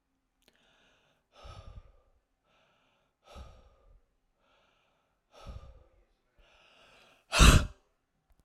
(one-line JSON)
{"exhalation_length": "8.4 s", "exhalation_amplitude": 16334, "exhalation_signal_mean_std_ratio": 0.17, "survey_phase": "alpha (2021-03-01 to 2021-08-12)", "age": "45-64", "gender": "Female", "wearing_mask": "No", "symptom_none": true, "smoker_status": "Never smoked", "respiratory_condition_asthma": false, "respiratory_condition_other": false, "recruitment_source": "REACT", "submission_delay": "1 day", "covid_test_result": "Negative", "covid_test_method": "RT-qPCR"}